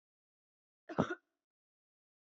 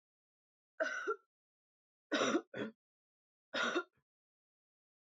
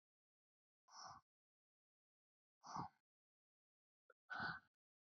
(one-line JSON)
{"cough_length": "2.2 s", "cough_amplitude": 4026, "cough_signal_mean_std_ratio": 0.19, "three_cough_length": "5.0 s", "three_cough_amplitude": 2695, "three_cough_signal_mean_std_ratio": 0.36, "exhalation_length": "5.0 s", "exhalation_amplitude": 516, "exhalation_signal_mean_std_ratio": 0.29, "survey_phase": "beta (2021-08-13 to 2022-03-07)", "age": "18-44", "gender": "Female", "wearing_mask": "No", "symptom_runny_or_blocked_nose": true, "symptom_fatigue": true, "symptom_headache": true, "symptom_onset": "6 days", "smoker_status": "Never smoked", "respiratory_condition_asthma": false, "respiratory_condition_other": false, "recruitment_source": "Test and Trace", "submission_delay": "1 day", "covid_test_result": "Positive", "covid_test_method": "RT-qPCR", "covid_ct_value": 24.2, "covid_ct_gene": "ORF1ab gene", "covid_ct_mean": 24.5, "covid_viral_load": "9300 copies/ml", "covid_viral_load_category": "Minimal viral load (< 10K copies/ml)"}